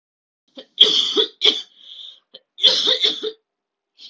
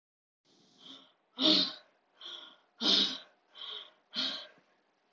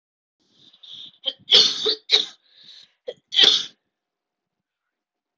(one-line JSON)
{"cough_length": "4.1 s", "cough_amplitude": 32768, "cough_signal_mean_std_ratio": 0.42, "exhalation_length": "5.1 s", "exhalation_amplitude": 7584, "exhalation_signal_mean_std_ratio": 0.36, "three_cough_length": "5.4 s", "three_cough_amplitude": 32521, "three_cough_signal_mean_std_ratio": 0.31, "survey_phase": "alpha (2021-03-01 to 2021-08-12)", "age": "18-44", "gender": "Female", "wearing_mask": "No", "symptom_cough_any": true, "symptom_new_continuous_cough": true, "symptom_fatigue": true, "symptom_headache": true, "smoker_status": "Never smoked", "respiratory_condition_asthma": false, "respiratory_condition_other": false, "recruitment_source": "Test and Trace", "submission_delay": "1 day", "covid_test_result": "Positive", "covid_test_method": "RT-qPCR", "covid_ct_value": 16.5, "covid_ct_gene": "ORF1ab gene", "covid_ct_mean": 16.9, "covid_viral_load": "2800000 copies/ml", "covid_viral_load_category": "High viral load (>1M copies/ml)"}